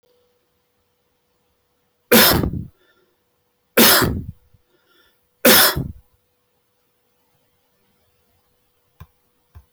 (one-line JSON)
{"three_cough_length": "9.7 s", "three_cough_amplitude": 28160, "three_cough_signal_mean_std_ratio": 0.29, "survey_phase": "beta (2021-08-13 to 2022-03-07)", "age": "45-64", "gender": "Male", "wearing_mask": "No", "symptom_none": true, "smoker_status": "Never smoked", "respiratory_condition_asthma": false, "respiratory_condition_other": false, "recruitment_source": "REACT", "submission_delay": "1 day", "covid_test_result": "Negative", "covid_test_method": "RT-qPCR"}